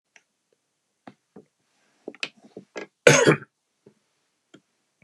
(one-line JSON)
{"cough_length": "5.0 s", "cough_amplitude": 32767, "cough_signal_mean_std_ratio": 0.2, "survey_phase": "beta (2021-08-13 to 2022-03-07)", "age": "65+", "gender": "Male", "wearing_mask": "No", "symptom_none": true, "smoker_status": "Never smoked", "respiratory_condition_asthma": false, "respiratory_condition_other": false, "recruitment_source": "REACT", "submission_delay": "2 days", "covid_test_result": "Negative", "covid_test_method": "RT-qPCR", "influenza_a_test_result": "Negative", "influenza_b_test_result": "Negative"}